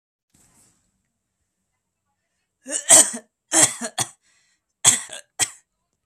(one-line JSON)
{"cough_length": "6.1 s", "cough_amplitude": 32768, "cough_signal_mean_std_ratio": 0.26, "survey_phase": "beta (2021-08-13 to 2022-03-07)", "age": "18-44", "gender": "Male", "wearing_mask": "No", "symptom_none": true, "smoker_status": "Never smoked", "respiratory_condition_asthma": false, "respiratory_condition_other": false, "recruitment_source": "REACT", "submission_delay": "5 days", "covid_test_result": "Negative", "covid_test_method": "RT-qPCR", "influenza_a_test_result": "Negative", "influenza_b_test_result": "Negative"}